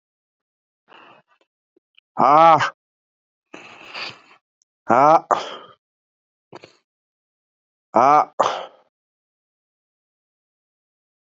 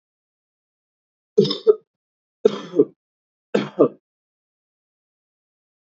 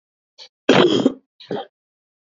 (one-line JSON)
{"exhalation_length": "11.3 s", "exhalation_amplitude": 31609, "exhalation_signal_mean_std_ratio": 0.26, "three_cough_length": "5.9 s", "three_cough_amplitude": 27404, "three_cough_signal_mean_std_ratio": 0.23, "cough_length": "2.3 s", "cough_amplitude": 27611, "cough_signal_mean_std_ratio": 0.36, "survey_phase": "beta (2021-08-13 to 2022-03-07)", "age": "18-44", "gender": "Male", "wearing_mask": "No", "symptom_cough_any": true, "symptom_runny_or_blocked_nose": true, "symptom_sore_throat": true, "symptom_abdominal_pain": true, "symptom_fatigue": true, "symptom_headache": true, "symptom_onset": "5 days", "smoker_status": "Never smoked", "respiratory_condition_asthma": false, "respiratory_condition_other": false, "recruitment_source": "Test and Trace", "submission_delay": "1 day", "covid_test_result": "Positive", "covid_test_method": "ePCR"}